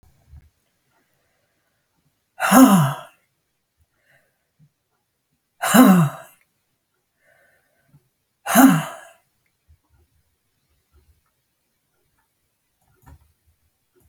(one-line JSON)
{"exhalation_length": "14.1 s", "exhalation_amplitude": 32767, "exhalation_signal_mean_std_ratio": 0.24, "survey_phase": "beta (2021-08-13 to 2022-03-07)", "age": "65+", "gender": "Female", "wearing_mask": "No", "symptom_none": true, "smoker_status": "Never smoked", "respiratory_condition_asthma": true, "respiratory_condition_other": false, "recruitment_source": "REACT", "submission_delay": "1 day", "covid_test_result": "Negative", "covid_test_method": "RT-qPCR"}